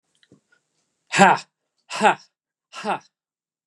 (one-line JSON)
{"exhalation_length": "3.7 s", "exhalation_amplitude": 32766, "exhalation_signal_mean_std_ratio": 0.28, "survey_phase": "beta (2021-08-13 to 2022-03-07)", "age": "18-44", "gender": "Male", "wearing_mask": "No", "symptom_runny_or_blocked_nose": true, "symptom_sore_throat": true, "symptom_onset": "4 days", "smoker_status": "Never smoked", "respiratory_condition_asthma": false, "respiratory_condition_other": false, "recruitment_source": "REACT", "submission_delay": "3 days", "covid_test_result": "Negative", "covid_test_method": "RT-qPCR", "influenza_a_test_result": "Negative", "influenza_b_test_result": "Negative"}